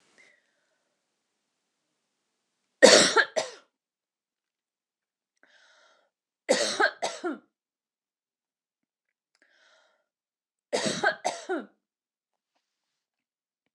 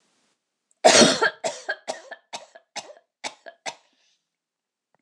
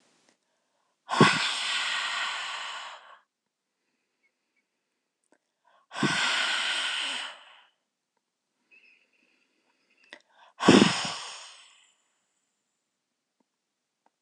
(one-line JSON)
{"three_cough_length": "13.7 s", "three_cough_amplitude": 26027, "three_cough_signal_mean_std_ratio": 0.23, "cough_length": "5.0 s", "cough_amplitude": 25675, "cough_signal_mean_std_ratio": 0.28, "exhalation_length": "14.2 s", "exhalation_amplitude": 20173, "exhalation_signal_mean_std_ratio": 0.34, "survey_phase": "beta (2021-08-13 to 2022-03-07)", "age": "45-64", "gender": "Female", "wearing_mask": "No", "symptom_none": true, "smoker_status": "Never smoked", "respiratory_condition_asthma": false, "respiratory_condition_other": false, "recruitment_source": "REACT", "submission_delay": "1 day", "covid_test_result": "Negative", "covid_test_method": "RT-qPCR", "influenza_a_test_result": "Negative", "influenza_b_test_result": "Negative"}